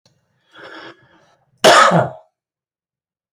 {"cough_length": "3.3 s", "cough_amplitude": 32768, "cough_signal_mean_std_ratio": 0.31, "survey_phase": "beta (2021-08-13 to 2022-03-07)", "age": "18-44", "gender": "Male", "wearing_mask": "No", "symptom_none": true, "smoker_status": "Never smoked", "respiratory_condition_asthma": false, "respiratory_condition_other": false, "recruitment_source": "REACT", "submission_delay": "1 day", "covid_test_result": "Negative", "covid_test_method": "RT-qPCR", "influenza_a_test_result": "Negative", "influenza_b_test_result": "Negative"}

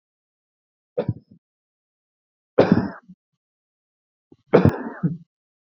{"three_cough_length": "5.7 s", "three_cough_amplitude": 30130, "three_cough_signal_mean_std_ratio": 0.25, "survey_phase": "beta (2021-08-13 to 2022-03-07)", "age": "18-44", "gender": "Male", "wearing_mask": "No", "symptom_none": true, "symptom_onset": "7 days", "smoker_status": "Never smoked", "respiratory_condition_asthma": false, "respiratory_condition_other": false, "recruitment_source": "REACT", "submission_delay": "2 days", "covid_test_result": "Negative", "covid_test_method": "RT-qPCR"}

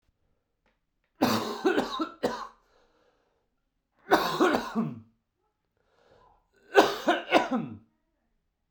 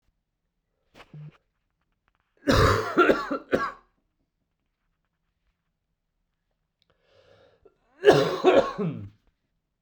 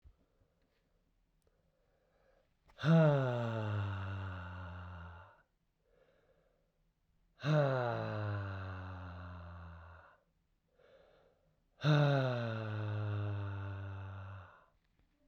{"three_cough_length": "8.7 s", "three_cough_amplitude": 21622, "three_cough_signal_mean_std_ratio": 0.38, "cough_length": "9.8 s", "cough_amplitude": 26122, "cough_signal_mean_std_ratio": 0.32, "exhalation_length": "15.3 s", "exhalation_amplitude": 4228, "exhalation_signal_mean_std_ratio": 0.51, "survey_phase": "beta (2021-08-13 to 2022-03-07)", "age": "18-44", "gender": "Male", "wearing_mask": "No", "symptom_cough_any": true, "symptom_fatigue": true, "symptom_headache": true, "symptom_change_to_sense_of_smell_or_taste": true, "symptom_loss_of_taste": true, "symptom_onset": "4 days", "smoker_status": "Never smoked", "respiratory_condition_asthma": false, "respiratory_condition_other": false, "recruitment_source": "Test and Trace", "submission_delay": "2 days", "covid_test_result": "Positive", "covid_test_method": "RT-qPCR"}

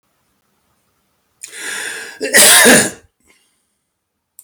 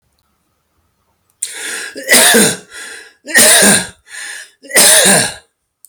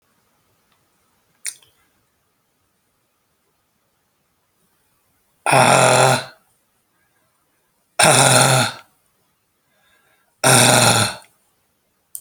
{"cough_length": "4.4 s", "cough_amplitude": 32768, "cough_signal_mean_std_ratio": 0.36, "three_cough_length": "5.9 s", "three_cough_amplitude": 32768, "three_cough_signal_mean_std_ratio": 0.51, "exhalation_length": "12.2 s", "exhalation_amplitude": 32768, "exhalation_signal_mean_std_ratio": 0.34, "survey_phase": "alpha (2021-03-01 to 2021-08-12)", "age": "45-64", "gender": "Male", "wearing_mask": "No", "symptom_cough_any": true, "smoker_status": "Ex-smoker", "respiratory_condition_asthma": false, "respiratory_condition_other": false, "recruitment_source": "REACT", "submission_delay": "1 day", "covid_test_result": "Negative", "covid_test_method": "RT-qPCR"}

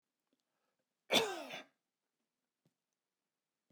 {"cough_length": "3.7 s", "cough_amplitude": 4837, "cough_signal_mean_std_ratio": 0.22, "survey_phase": "beta (2021-08-13 to 2022-03-07)", "age": "45-64", "gender": "Male", "wearing_mask": "No", "symptom_none": true, "smoker_status": "Never smoked", "respiratory_condition_asthma": false, "respiratory_condition_other": false, "recruitment_source": "REACT", "submission_delay": "1 day", "covid_test_result": "Negative", "covid_test_method": "RT-qPCR"}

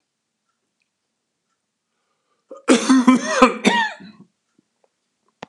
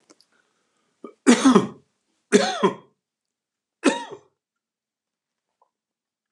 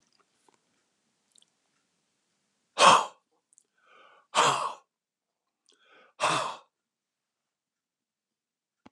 {"cough_length": "5.5 s", "cough_amplitude": 32767, "cough_signal_mean_std_ratio": 0.33, "three_cough_length": "6.3 s", "three_cough_amplitude": 28708, "three_cough_signal_mean_std_ratio": 0.27, "exhalation_length": "8.9 s", "exhalation_amplitude": 21920, "exhalation_signal_mean_std_ratio": 0.23, "survey_phase": "beta (2021-08-13 to 2022-03-07)", "age": "65+", "gender": "Male", "wearing_mask": "No", "symptom_runny_or_blocked_nose": true, "symptom_sore_throat": true, "symptom_onset": "8 days", "smoker_status": "Never smoked", "respiratory_condition_asthma": false, "respiratory_condition_other": false, "recruitment_source": "REACT", "submission_delay": "0 days", "covid_test_result": "Negative", "covid_test_method": "RT-qPCR"}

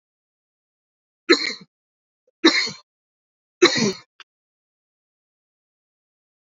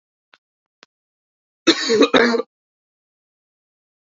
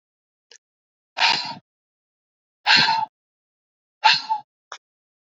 {"three_cough_length": "6.6 s", "three_cough_amplitude": 29542, "three_cough_signal_mean_std_ratio": 0.24, "cough_length": "4.2 s", "cough_amplitude": 32768, "cough_signal_mean_std_ratio": 0.3, "exhalation_length": "5.4 s", "exhalation_amplitude": 27490, "exhalation_signal_mean_std_ratio": 0.32, "survey_phase": "beta (2021-08-13 to 2022-03-07)", "age": "18-44", "gender": "Male", "wearing_mask": "No", "symptom_cough_any": true, "symptom_runny_or_blocked_nose": true, "symptom_headache": true, "smoker_status": "Never smoked", "respiratory_condition_asthma": false, "respiratory_condition_other": false, "recruitment_source": "Test and Trace", "submission_delay": "1 day", "covid_test_result": "Positive", "covid_test_method": "LFT"}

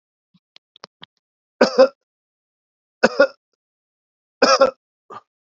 {"three_cough_length": "5.5 s", "three_cough_amplitude": 32767, "three_cough_signal_mean_std_ratio": 0.25, "survey_phase": "alpha (2021-03-01 to 2021-08-12)", "age": "18-44", "gender": "Male", "wearing_mask": "No", "symptom_cough_any": true, "symptom_fatigue": true, "symptom_fever_high_temperature": true, "symptom_headache": true, "symptom_loss_of_taste": true, "smoker_status": "Ex-smoker", "respiratory_condition_asthma": false, "respiratory_condition_other": false, "recruitment_source": "Test and Trace", "submission_delay": "1 day", "covid_test_result": "Positive", "covid_test_method": "RT-qPCR", "covid_ct_value": 32.5, "covid_ct_gene": "N gene"}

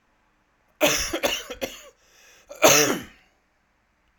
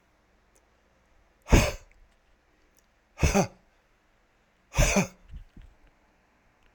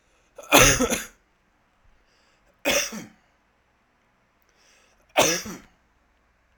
{"cough_length": "4.2 s", "cough_amplitude": 28755, "cough_signal_mean_std_ratio": 0.36, "exhalation_length": "6.7 s", "exhalation_amplitude": 18949, "exhalation_signal_mean_std_ratio": 0.27, "three_cough_length": "6.6 s", "three_cough_amplitude": 32767, "three_cough_signal_mean_std_ratio": 0.29, "survey_phase": "alpha (2021-03-01 to 2021-08-12)", "age": "45-64", "gender": "Male", "wearing_mask": "No", "symptom_none": true, "smoker_status": "Ex-smoker", "respiratory_condition_asthma": false, "respiratory_condition_other": false, "recruitment_source": "REACT", "submission_delay": "1 day", "covid_test_result": "Negative", "covid_test_method": "RT-qPCR"}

